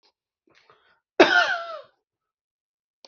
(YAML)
cough_length: 3.1 s
cough_amplitude: 27387
cough_signal_mean_std_ratio: 0.27
survey_phase: beta (2021-08-13 to 2022-03-07)
age: 45-64
gender: Male
wearing_mask: 'No'
symptom_none: true
smoker_status: Ex-smoker
respiratory_condition_asthma: false
respiratory_condition_other: false
recruitment_source: REACT
submission_delay: 3 days
covid_test_result: Negative
covid_test_method: RT-qPCR